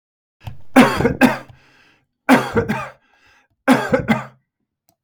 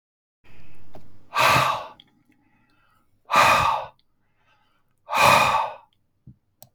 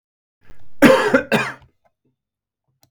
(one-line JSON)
{"three_cough_length": "5.0 s", "three_cough_amplitude": 32768, "three_cough_signal_mean_std_ratio": 0.41, "exhalation_length": "6.7 s", "exhalation_amplitude": 22929, "exhalation_signal_mean_std_ratio": 0.46, "cough_length": "2.9 s", "cough_amplitude": 32768, "cough_signal_mean_std_ratio": 0.38, "survey_phase": "beta (2021-08-13 to 2022-03-07)", "age": "45-64", "gender": "Male", "wearing_mask": "No", "symptom_none": true, "smoker_status": "Ex-smoker", "respiratory_condition_asthma": false, "respiratory_condition_other": false, "recruitment_source": "REACT", "submission_delay": "1 day", "covid_test_result": "Negative", "covid_test_method": "RT-qPCR"}